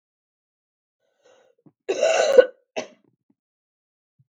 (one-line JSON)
{"cough_length": "4.4 s", "cough_amplitude": 32768, "cough_signal_mean_std_ratio": 0.25, "survey_phase": "beta (2021-08-13 to 2022-03-07)", "age": "45-64", "gender": "Female", "wearing_mask": "No", "symptom_cough_any": true, "symptom_new_continuous_cough": true, "symptom_sore_throat": true, "symptom_fatigue": true, "symptom_fever_high_temperature": true, "symptom_headache": true, "symptom_onset": "2 days", "smoker_status": "Never smoked", "respiratory_condition_asthma": false, "respiratory_condition_other": false, "recruitment_source": "Test and Trace", "submission_delay": "2 days", "covid_test_result": "Positive", "covid_test_method": "RT-qPCR", "covid_ct_value": 31.5, "covid_ct_gene": "ORF1ab gene"}